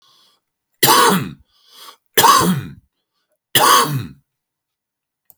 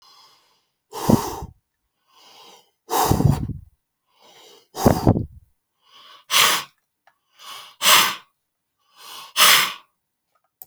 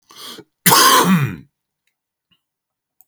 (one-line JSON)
{"three_cough_length": "5.4 s", "three_cough_amplitude": 32768, "three_cough_signal_mean_std_ratio": 0.42, "exhalation_length": "10.7 s", "exhalation_amplitude": 32767, "exhalation_signal_mean_std_ratio": 0.35, "cough_length": "3.1 s", "cough_amplitude": 32768, "cough_signal_mean_std_ratio": 0.4, "survey_phase": "beta (2021-08-13 to 2022-03-07)", "age": "45-64", "gender": "Male", "wearing_mask": "No", "symptom_none": true, "smoker_status": "Current smoker (11 or more cigarettes per day)", "respiratory_condition_asthma": false, "respiratory_condition_other": false, "recruitment_source": "REACT", "submission_delay": "2 days", "covid_test_result": "Negative", "covid_test_method": "RT-qPCR"}